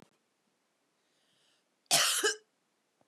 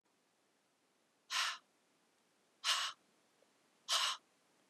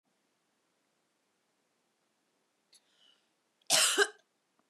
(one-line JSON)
{"cough_length": "3.1 s", "cough_amplitude": 10102, "cough_signal_mean_std_ratio": 0.3, "exhalation_length": "4.7 s", "exhalation_amplitude": 3132, "exhalation_signal_mean_std_ratio": 0.34, "three_cough_length": "4.7 s", "three_cough_amplitude": 8426, "three_cough_signal_mean_std_ratio": 0.22, "survey_phase": "beta (2021-08-13 to 2022-03-07)", "age": "18-44", "gender": "Female", "wearing_mask": "No", "symptom_cough_any": true, "smoker_status": "Prefer not to say", "respiratory_condition_asthma": false, "respiratory_condition_other": false, "recruitment_source": "Test and Trace", "submission_delay": "3 days", "covid_test_result": "Negative", "covid_test_method": "LFT"}